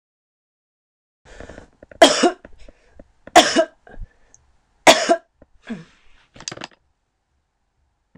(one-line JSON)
{"three_cough_length": "8.2 s", "three_cough_amplitude": 26028, "three_cough_signal_mean_std_ratio": 0.25, "survey_phase": "beta (2021-08-13 to 2022-03-07)", "age": "65+", "gender": "Female", "wearing_mask": "No", "symptom_cough_any": true, "symptom_runny_or_blocked_nose": true, "symptom_onset": "7 days", "smoker_status": "Ex-smoker", "respiratory_condition_asthma": false, "respiratory_condition_other": false, "recruitment_source": "REACT", "submission_delay": "2 days", "covid_test_result": "Negative", "covid_test_method": "RT-qPCR"}